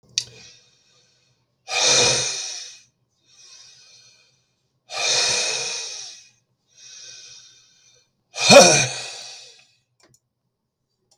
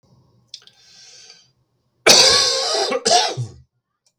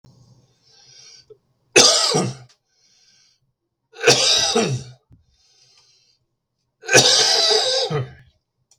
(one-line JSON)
{"exhalation_length": "11.2 s", "exhalation_amplitude": 32768, "exhalation_signal_mean_std_ratio": 0.32, "cough_length": "4.2 s", "cough_amplitude": 32768, "cough_signal_mean_std_ratio": 0.44, "three_cough_length": "8.8 s", "three_cough_amplitude": 32768, "three_cough_signal_mean_std_ratio": 0.43, "survey_phase": "beta (2021-08-13 to 2022-03-07)", "age": "45-64", "gender": "Male", "wearing_mask": "No", "symptom_cough_any": true, "symptom_runny_or_blocked_nose": true, "symptom_change_to_sense_of_smell_or_taste": true, "symptom_loss_of_taste": true, "symptom_onset": "4 days", "smoker_status": "Never smoked", "respiratory_condition_asthma": false, "respiratory_condition_other": false, "recruitment_source": "REACT", "submission_delay": "1 day", "covid_test_result": "Negative", "covid_test_method": "RT-qPCR", "influenza_a_test_result": "Negative", "influenza_b_test_result": "Negative"}